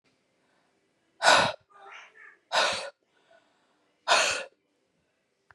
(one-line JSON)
{"exhalation_length": "5.5 s", "exhalation_amplitude": 17578, "exhalation_signal_mean_std_ratio": 0.32, "survey_phase": "beta (2021-08-13 to 2022-03-07)", "age": "18-44", "gender": "Female", "wearing_mask": "No", "symptom_cough_any": true, "symptom_runny_or_blocked_nose": true, "symptom_fatigue": true, "smoker_status": "Never smoked", "respiratory_condition_asthma": false, "respiratory_condition_other": false, "recruitment_source": "Test and Trace", "submission_delay": "2 days", "covid_test_result": "Positive", "covid_test_method": "RT-qPCR", "covid_ct_value": 27.2, "covid_ct_gene": "ORF1ab gene"}